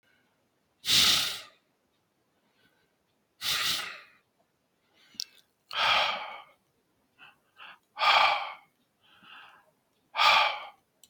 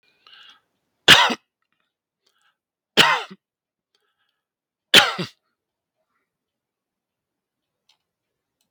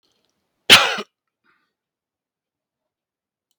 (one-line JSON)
{"exhalation_length": "11.1 s", "exhalation_amplitude": 12142, "exhalation_signal_mean_std_ratio": 0.37, "three_cough_length": "8.7 s", "three_cough_amplitude": 32768, "three_cough_signal_mean_std_ratio": 0.2, "cough_length": "3.6 s", "cough_amplitude": 32768, "cough_signal_mean_std_ratio": 0.18, "survey_phase": "beta (2021-08-13 to 2022-03-07)", "age": "65+", "gender": "Male", "wearing_mask": "No", "symptom_none": true, "symptom_onset": "10 days", "smoker_status": "Never smoked", "respiratory_condition_asthma": false, "respiratory_condition_other": false, "recruitment_source": "REACT", "submission_delay": "2 days", "covid_test_result": "Negative", "covid_test_method": "RT-qPCR"}